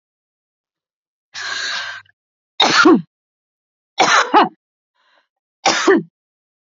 {"three_cough_length": "6.7 s", "three_cough_amplitude": 31976, "three_cough_signal_mean_std_ratio": 0.38, "survey_phase": "beta (2021-08-13 to 2022-03-07)", "age": "45-64", "gender": "Female", "wearing_mask": "No", "symptom_none": true, "symptom_onset": "6 days", "smoker_status": "Never smoked", "respiratory_condition_asthma": false, "respiratory_condition_other": false, "recruitment_source": "REACT", "submission_delay": "1 day", "covid_test_result": "Negative", "covid_test_method": "RT-qPCR", "influenza_a_test_result": "Unknown/Void", "influenza_b_test_result": "Unknown/Void"}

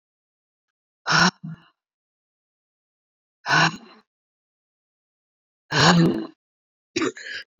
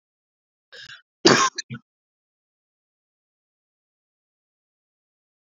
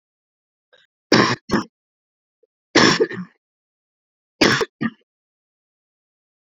{"exhalation_length": "7.6 s", "exhalation_amplitude": 23295, "exhalation_signal_mean_std_ratio": 0.32, "cough_length": "5.5 s", "cough_amplitude": 27717, "cough_signal_mean_std_ratio": 0.17, "three_cough_length": "6.6 s", "three_cough_amplitude": 30015, "three_cough_signal_mean_std_ratio": 0.3, "survey_phase": "beta (2021-08-13 to 2022-03-07)", "age": "45-64", "gender": "Female", "wearing_mask": "No", "symptom_cough_any": true, "symptom_runny_or_blocked_nose": true, "symptom_sore_throat": true, "symptom_fatigue": true, "symptom_fever_high_temperature": true, "symptom_onset": "2 days", "smoker_status": "Never smoked", "respiratory_condition_asthma": true, "respiratory_condition_other": false, "recruitment_source": "Test and Trace", "submission_delay": "1 day", "covid_test_result": "Positive", "covid_test_method": "RT-qPCR", "covid_ct_value": 20.4, "covid_ct_gene": "ORF1ab gene"}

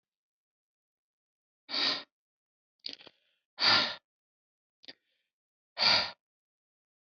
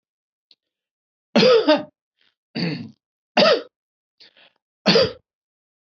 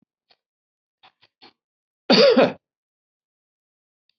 {"exhalation_length": "7.1 s", "exhalation_amplitude": 10471, "exhalation_signal_mean_std_ratio": 0.28, "three_cough_length": "6.0 s", "three_cough_amplitude": 24224, "three_cough_signal_mean_std_ratio": 0.35, "cough_length": "4.2 s", "cough_amplitude": 24959, "cough_signal_mean_std_ratio": 0.25, "survey_phase": "beta (2021-08-13 to 2022-03-07)", "age": "45-64", "gender": "Male", "wearing_mask": "No", "symptom_none": true, "smoker_status": "Never smoked", "respiratory_condition_asthma": false, "respiratory_condition_other": false, "recruitment_source": "REACT", "submission_delay": "1 day", "covid_test_result": "Negative", "covid_test_method": "RT-qPCR", "influenza_a_test_result": "Negative", "influenza_b_test_result": "Negative"}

